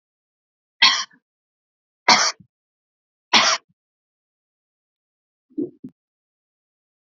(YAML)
three_cough_length: 7.1 s
three_cough_amplitude: 32768
three_cough_signal_mean_std_ratio: 0.24
survey_phase: beta (2021-08-13 to 2022-03-07)
age: 45-64
gender: Female
wearing_mask: 'Yes'
symptom_none: true
smoker_status: Never smoked
respiratory_condition_asthma: false
respiratory_condition_other: false
recruitment_source: REACT
submission_delay: 1 day
covid_test_result: Negative
covid_test_method: RT-qPCR